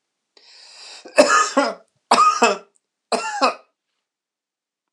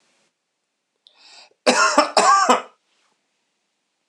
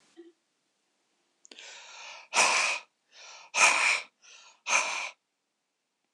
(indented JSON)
{
  "three_cough_length": "4.9 s",
  "three_cough_amplitude": 26028,
  "three_cough_signal_mean_std_ratio": 0.4,
  "cough_length": "4.1 s",
  "cough_amplitude": 26028,
  "cough_signal_mean_std_ratio": 0.36,
  "exhalation_length": "6.1 s",
  "exhalation_amplitude": 14929,
  "exhalation_signal_mean_std_ratio": 0.38,
  "survey_phase": "alpha (2021-03-01 to 2021-08-12)",
  "age": "45-64",
  "gender": "Male",
  "wearing_mask": "No",
  "symptom_none": true,
  "smoker_status": "Never smoked",
  "respiratory_condition_asthma": false,
  "respiratory_condition_other": false,
  "recruitment_source": "REACT",
  "submission_delay": "1 day",
  "covid_test_result": "Negative",
  "covid_test_method": "RT-qPCR"
}